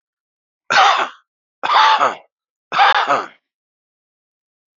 exhalation_length: 4.8 s
exhalation_amplitude: 30186
exhalation_signal_mean_std_ratio: 0.43
survey_phase: beta (2021-08-13 to 2022-03-07)
age: 45-64
gender: Male
wearing_mask: 'No'
symptom_runny_or_blocked_nose: true
symptom_sore_throat: true
symptom_diarrhoea: true
symptom_fatigue: true
symptom_fever_high_temperature: true
symptom_headache: true
symptom_onset: 4 days
smoker_status: Current smoker (1 to 10 cigarettes per day)
respiratory_condition_asthma: false
respiratory_condition_other: false
recruitment_source: Test and Trace
submission_delay: 2 days
covid_test_result: Positive
covid_test_method: ePCR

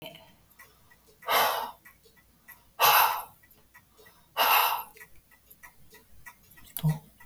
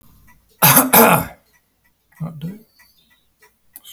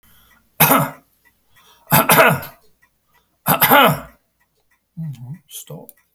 exhalation_length: 7.3 s
exhalation_amplitude: 14578
exhalation_signal_mean_std_ratio: 0.38
cough_length: 3.9 s
cough_amplitude: 32768
cough_signal_mean_std_ratio: 0.34
three_cough_length: 6.1 s
three_cough_amplitude: 32768
three_cough_signal_mean_std_ratio: 0.38
survey_phase: beta (2021-08-13 to 2022-03-07)
age: 65+
gender: Male
wearing_mask: 'No'
symptom_runny_or_blocked_nose: true
smoker_status: Never smoked
respiratory_condition_asthma: false
respiratory_condition_other: false
recruitment_source: REACT
submission_delay: 1 day
covid_test_result: Negative
covid_test_method: RT-qPCR
influenza_a_test_result: Negative
influenza_b_test_result: Negative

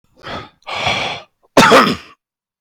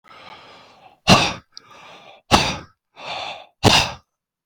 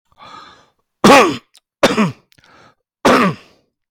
cough_length: 2.6 s
cough_amplitude: 32767
cough_signal_mean_std_ratio: 0.45
exhalation_length: 4.5 s
exhalation_amplitude: 32768
exhalation_signal_mean_std_ratio: 0.35
three_cough_length: 3.9 s
three_cough_amplitude: 32768
three_cough_signal_mean_std_ratio: 0.4
survey_phase: beta (2021-08-13 to 2022-03-07)
age: 45-64
gender: Male
wearing_mask: 'No'
symptom_none: true
smoker_status: Never smoked
respiratory_condition_asthma: true
respiratory_condition_other: false
recruitment_source: REACT
submission_delay: 1 day
covid_test_result: Negative
covid_test_method: RT-qPCR
influenza_a_test_result: Negative
influenza_b_test_result: Negative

